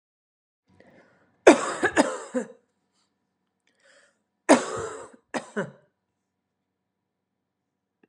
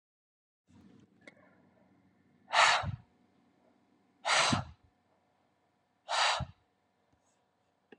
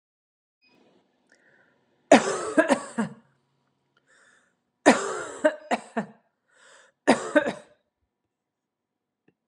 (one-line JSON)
{"cough_length": "8.1 s", "cough_amplitude": 32767, "cough_signal_mean_std_ratio": 0.23, "exhalation_length": "8.0 s", "exhalation_amplitude": 8901, "exhalation_signal_mean_std_ratio": 0.3, "three_cough_length": "9.5 s", "three_cough_amplitude": 29644, "three_cough_signal_mean_std_ratio": 0.27, "survey_phase": "beta (2021-08-13 to 2022-03-07)", "age": "45-64", "gender": "Female", "wearing_mask": "No", "symptom_none": true, "smoker_status": "Never smoked", "respiratory_condition_asthma": false, "respiratory_condition_other": false, "recruitment_source": "Test and Trace", "submission_delay": "2 days", "covid_test_result": "Positive", "covid_test_method": "RT-qPCR", "covid_ct_value": 20.2, "covid_ct_gene": "N gene"}